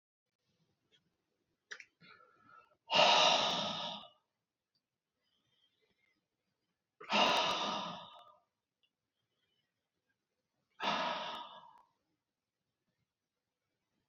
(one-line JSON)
{"exhalation_length": "14.1 s", "exhalation_amplitude": 6819, "exhalation_signal_mean_std_ratio": 0.31, "survey_phase": "beta (2021-08-13 to 2022-03-07)", "age": "45-64", "gender": "Male", "wearing_mask": "No", "symptom_none": true, "smoker_status": "Never smoked", "respiratory_condition_asthma": false, "respiratory_condition_other": false, "recruitment_source": "REACT", "submission_delay": "1 day", "covid_test_result": "Negative", "covid_test_method": "RT-qPCR", "influenza_a_test_result": "Negative", "influenza_b_test_result": "Negative"}